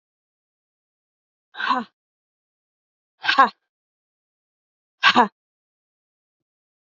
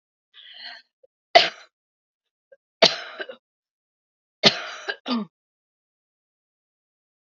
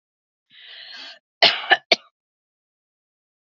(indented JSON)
{
  "exhalation_length": "7.0 s",
  "exhalation_amplitude": 31621,
  "exhalation_signal_mean_std_ratio": 0.21,
  "three_cough_length": "7.3 s",
  "three_cough_amplitude": 32768,
  "three_cough_signal_mean_std_ratio": 0.21,
  "cough_length": "3.5 s",
  "cough_amplitude": 29837,
  "cough_signal_mean_std_ratio": 0.22,
  "survey_phase": "beta (2021-08-13 to 2022-03-07)",
  "age": "18-44",
  "gender": "Female",
  "wearing_mask": "No",
  "symptom_cough_any": true,
  "symptom_shortness_of_breath": true,
  "symptom_sore_throat": true,
  "symptom_abdominal_pain": true,
  "symptom_fatigue": true,
  "symptom_headache": true,
  "symptom_onset": "2 days",
  "smoker_status": "Never smoked",
  "respiratory_condition_asthma": false,
  "respiratory_condition_other": false,
  "recruitment_source": "Test and Trace",
  "submission_delay": "1 day",
  "covid_test_result": "Positive",
  "covid_test_method": "RT-qPCR",
  "covid_ct_value": 18.9,
  "covid_ct_gene": "N gene"
}